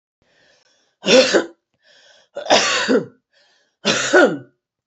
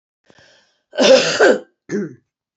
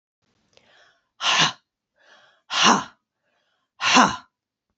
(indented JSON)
{
  "three_cough_length": "4.9 s",
  "three_cough_amplitude": 28513,
  "three_cough_signal_mean_std_ratio": 0.43,
  "cough_length": "2.6 s",
  "cough_amplitude": 29539,
  "cough_signal_mean_std_ratio": 0.43,
  "exhalation_length": "4.8 s",
  "exhalation_amplitude": 27841,
  "exhalation_signal_mean_std_ratio": 0.34,
  "survey_phase": "beta (2021-08-13 to 2022-03-07)",
  "age": "45-64",
  "gender": "Female",
  "wearing_mask": "No",
  "symptom_sore_throat": true,
  "symptom_headache": true,
  "symptom_onset": "2 days",
  "smoker_status": "Ex-smoker",
  "respiratory_condition_asthma": true,
  "respiratory_condition_other": false,
  "recruitment_source": "Test and Trace",
  "submission_delay": "1 day",
  "covid_test_result": "Positive",
  "covid_test_method": "RT-qPCR",
  "covid_ct_value": 20.6,
  "covid_ct_gene": "N gene"
}